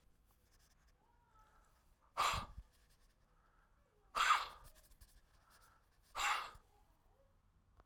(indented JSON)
{
  "exhalation_length": "7.9 s",
  "exhalation_amplitude": 3130,
  "exhalation_signal_mean_std_ratio": 0.3,
  "survey_phase": "alpha (2021-03-01 to 2021-08-12)",
  "age": "65+",
  "gender": "Male",
  "wearing_mask": "No",
  "symptom_none": true,
  "smoker_status": "Ex-smoker",
  "respiratory_condition_asthma": false,
  "respiratory_condition_other": true,
  "recruitment_source": "REACT",
  "submission_delay": "1 day",
  "covid_test_result": "Negative",
  "covid_test_method": "RT-qPCR"
}